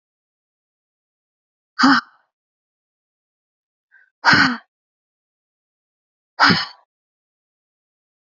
{"exhalation_length": "8.3 s", "exhalation_amplitude": 30039, "exhalation_signal_mean_std_ratio": 0.23, "survey_phase": "beta (2021-08-13 to 2022-03-07)", "age": "18-44", "gender": "Female", "wearing_mask": "No", "symptom_cough_any": true, "symptom_runny_or_blocked_nose": true, "symptom_sore_throat": true, "smoker_status": "Never smoked", "respiratory_condition_asthma": false, "respiratory_condition_other": false, "recruitment_source": "Test and Trace", "submission_delay": "2 days", "covid_test_result": "Positive", "covid_test_method": "RT-qPCR", "covid_ct_value": 18.0, "covid_ct_gene": "ORF1ab gene"}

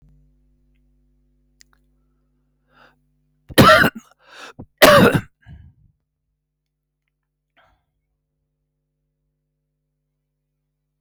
{"cough_length": "11.0 s", "cough_amplitude": 32768, "cough_signal_mean_std_ratio": 0.21, "survey_phase": "alpha (2021-03-01 to 2021-08-12)", "age": "65+", "gender": "Male", "wearing_mask": "No", "symptom_cough_any": true, "symptom_shortness_of_breath": true, "smoker_status": "Ex-smoker", "respiratory_condition_asthma": false, "respiratory_condition_other": false, "recruitment_source": "REACT", "submission_delay": "22 days", "covid_test_result": "Negative", "covid_test_method": "RT-qPCR"}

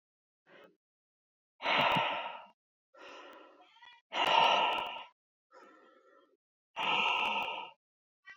{"exhalation_length": "8.4 s", "exhalation_amplitude": 8016, "exhalation_signal_mean_std_ratio": 0.45, "survey_phase": "beta (2021-08-13 to 2022-03-07)", "age": "18-44", "gender": "Male", "wearing_mask": "No", "symptom_none": true, "smoker_status": "Ex-smoker", "respiratory_condition_asthma": false, "respiratory_condition_other": false, "recruitment_source": "REACT", "submission_delay": "1 day", "covid_test_result": "Negative", "covid_test_method": "RT-qPCR", "influenza_a_test_result": "Negative", "influenza_b_test_result": "Negative"}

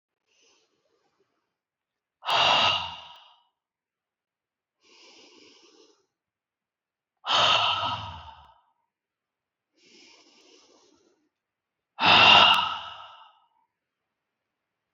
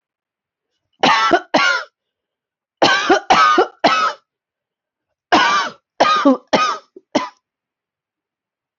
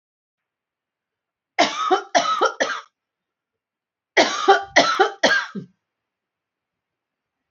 {"exhalation_length": "14.9 s", "exhalation_amplitude": 21762, "exhalation_signal_mean_std_ratio": 0.29, "cough_length": "8.8 s", "cough_amplitude": 29205, "cough_signal_mean_std_ratio": 0.47, "three_cough_length": "7.5 s", "three_cough_amplitude": 28104, "three_cough_signal_mean_std_ratio": 0.38, "survey_phase": "beta (2021-08-13 to 2022-03-07)", "age": "18-44", "gender": "Female", "wearing_mask": "No", "symptom_runny_or_blocked_nose": true, "symptom_fever_high_temperature": true, "symptom_other": true, "symptom_onset": "3 days", "smoker_status": "Current smoker (1 to 10 cigarettes per day)", "respiratory_condition_asthma": false, "respiratory_condition_other": false, "recruitment_source": "Test and Trace", "submission_delay": "1 day", "covid_test_result": "Positive", "covid_test_method": "RT-qPCR", "covid_ct_value": 29.5, "covid_ct_gene": "ORF1ab gene"}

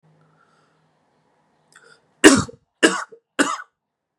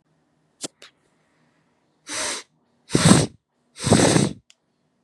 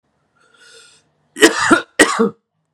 {"three_cough_length": "4.2 s", "three_cough_amplitude": 32768, "three_cough_signal_mean_std_ratio": 0.24, "exhalation_length": "5.0 s", "exhalation_amplitude": 32768, "exhalation_signal_mean_std_ratio": 0.34, "cough_length": "2.7 s", "cough_amplitude": 32768, "cough_signal_mean_std_ratio": 0.36, "survey_phase": "beta (2021-08-13 to 2022-03-07)", "age": "18-44", "gender": "Male", "wearing_mask": "No", "symptom_none": true, "smoker_status": "Ex-smoker", "respiratory_condition_asthma": false, "respiratory_condition_other": false, "recruitment_source": "REACT", "submission_delay": "1 day", "covid_test_result": "Negative", "covid_test_method": "RT-qPCR", "influenza_a_test_result": "Negative", "influenza_b_test_result": "Negative"}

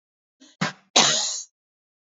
{"cough_length": "2.1 s", "cough_amplitude": 29430, "cough_signal_mean_std_ratio": 0.37, "survey_phase": "beta (2021-08-13 to 2022-03-07)", "age": "18-44", "gender": "Female", "wearing_mask": "No", "symptom_cough_any": true, "symptom_runny_or_blocked_nose": true, "symptom_fatigue": true, "symptom_headache": true, "symptom_change_to_sense_of_smell_or_taste": true, "symptom_loss_of_taste": true, "smoker_status": "Never smoked", "respiratory_condition_asthma": false, "respiratory_condition_other": false, "recruitment_source": "Test and Trace", "submission_delay": "2 days", "covid_test_result": "Positive", "covid_test_method": "RT-qPCR"}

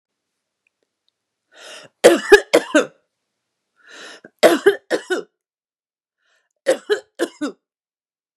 {"three_cough_length": "8.4 s", "three_cough_amplitude": 32768, "three_cough_signal_mean_std_ratio": 0.27, "survey_phase": "beta (2021-08-13 to 2022-03-07)", "age": "65+", "gender": "Female", "wearing_mask": "No", "symptom_none": true, "smoker_status": "Ex-smoker", "respiratory_condition_asthma": false, "respiratory_condition_other": false, "recruitment_source": "REACT", "submission_delay": "1 day", "covid_test_result": "Negative", "covid_test_method": "RT-qPCR", "influenza_a_test_result": "Negative", "influenza_b_test_result": "Negative"}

